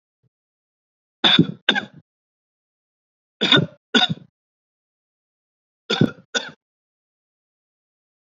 {"three_cough_length": "8.4 s", "three_cough_amplitude": 28423, "three_cough_signal_mean_std_ratio": 0.25, "survey_phase": "beta (2021-08-13 to 2022-03-07)", "age": "18-44", "gender": "Male", "wearing_mask": "No", "symptom_change_to_sense_of_smell_or_taste": true, "smoker_status": "Never smoked", "respiratory_condition_asthma": false, "respiratory_condition_other": false, "recruitment_source": "REACT", "submission_delay": "2 days", "covid_test_result": "Negative", "covid_test_method": "RT-qPCR"}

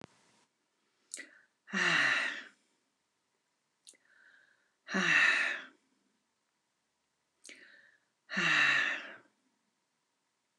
{"exhalation_length": "10.6 s", "exhalation_amplitude": 7312, "exhalation_signal_mean_std_ratio": 0.37, "survey_phase": "alpha (2021-03-01 to 2021-08-12)", "age": "65+", "gender": "Female", "wearing_mask": "No", "symptom_shortness_of_breath": true, "symptom_onset": "12 days", "smoker_status": "Ex-smoker", "respiratory_condition_asthma": false, "respiratory_condition_other": true, "recruitment_source": "REACT", "submission_delay": "1 day", "covid_test_result": "Negative", "covid_test_method": "RT-qPCR"}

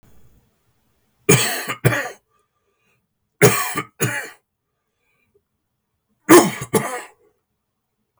{"three_cough_length": "8.2 s", "three_cough_amplitude": 32768, "three_cough_signal_mean_std_ratio": 0.3, "survey_phase": "beta (2021-08-13 to 2022-03-07)", "age": "65+", "gender": "Male", "wearing_mask": "No", "symptom_cough_any": true, "symptom_shortness_of_breath": true, "symptom_onset": "12 days", "smoker_status": "Ex-smoker", "respiratory_condition_asthma": false, "respiratory_condition_other": false, "recruitment_source": "REACT", "submission_delay": "1 day", "covid_test_result": "Negative", "covid_test_method": "RT-qPCR", "influenza_a_test_result": "Positive", "influenza_a_ct_value": 34.8, "influenza_b_test_result": "Positive", "influenza_b_ct_value": 35.9}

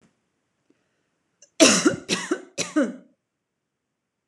{"three_cough_length": "4.3 s", "three_cough_amplitude": 25667, "three_cough_signal_mean_std_ratio": 0.31, "survey_phase": "beta (2021-08-13 to 2022-03-07)", "age": "18-44", "gender": "Female", "wearing_mask": "No", "symptom_none": true, "smoker_status": "Ex-smoker", "respiratory_condition_asthma": false, "respiratory_condition_other": false, "recruitment_source": "REACT", "submission_delay": "1 day", "covid_test_result": "Negative", "covid_test_method": "RT-qPCR"}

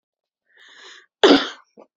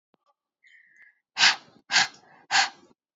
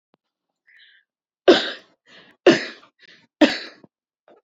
{"cough_length": "2.0 s", "cough_amplitude": 27851, "cough_signal_mean_std_ratio": 0.27, "exhalation_length": "3.2 s", "exhalation_amplitude": 20937, "exhalation_signal_mean_std_ratio": 0.31, "three_cough_length": "4.4 s", "three_cough_amplitude": 31013, "three_cough_signal_mean_std_ratio": 0.24, "survey_phase": "beta (2021-08-13 to 2022-03-07)", "age": "18-44", "gender": "Female", "wearing_mask": "No", "symptom_none": true, "smoker_status": "Never smoked", "respiratory_condition_asthma": false, "respiratory_condition_other": false, "recruitment_source": "REACT", "submission_delay": "1 day", "covid_test_result": "Negative", "covid_test_method": "RT-qPCR", "influenza_a_test_result": "Negative", "influenza_b_test_result": "Negative"}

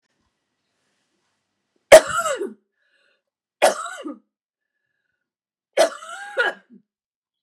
{"three_cough_length": "7.4 s", "three_cough_amplitude": 32768, "three_cough_signal_mean_std_ratio": 0.22, "survey_phase": "beta (2021-08-13 to 2022-03-07)", "age": "45-64", "gender": "Female", "wearing_mask": "No", "symptom_cough_any": true, "symptom_runny_or_blocked_nose": true, "symptom_fatigue": true, "symptom_onset": "2 days", "smoker_status": "Never smoked", "respiratory_condition_asthma": false, "respiratory_condition_other": false, "recruitment_source": "Test and Trace", "submission_delay": "1 day", "covid_test_result": "Negative", "covid_test_method": "ePCR"}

